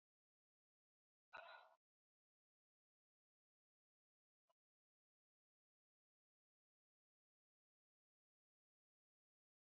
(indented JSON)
{
  "exhalation_length": "9.7 s",
  "exhalation_amplitude": 234,
  "exhalation_signal_mean_std_ratio": 0.14,
  "survey_phase": "beta (2021-08-13 to 2022-03-07)",
  "age": "65+",
  "gender": "Female",
  "wearing_mask": "No",
  "symptom_none": true,
  "smoker_status": "Ex-smoker",
  "respiratory_condition_asthma": false,
  "respiratory_condition_other": false,
  "recruitment_source": "REACT",
  "submission_delay": "5 days",
  "covid_test_result": "Negative",
  "covid_test_method": "RT-qPCR",
  "influenza_a_test_result": "Negative",
  "influenza_b_test_result": "Negative"
}